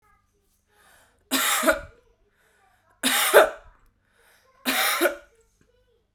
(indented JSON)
{
  "three_cough_length": "6.1 s",
  "three_cough_amplitude": 32621,
  "three_cough_signal_mean_std_ratio": 0.36,
  "survey_phase": "beta (2021-08-13 to 2022-03-07)",
  "age": "18-44",
  "gender": "Female",
  "wearing_mask": "No",
  "symptom_runny_or_blocked_nose": true,
  "symptom_sore_throat": true,
  "symptom_fatigue": true,
  "symptom_headache": true,
  "symptom_change_to_sense_of_smell_or_taste": true,
  "symptom_loss_of_taste": true,
  "symptom_onset": "3 days",
  "smoker_status": "Never smoked",
  "respiratory_condition_asthma": false,
  "respiratory_condition_other": false,
  "recruitment_source": "Test and Trace",
  "submission_delay": "1 day",
  "covid_test_result": "Positive",
  "covid_test_method": "RT-qPCR",
  "covid_ct_value": 17.1,
  "covid_ct_gene": "ORF1ab gene",
  "covid_ct_mean": 17.4,
  "covid_viral_load": "2000000 copies/ml",
  "covid_viral_load_category": "High viral load (>1M copies/ml)"
}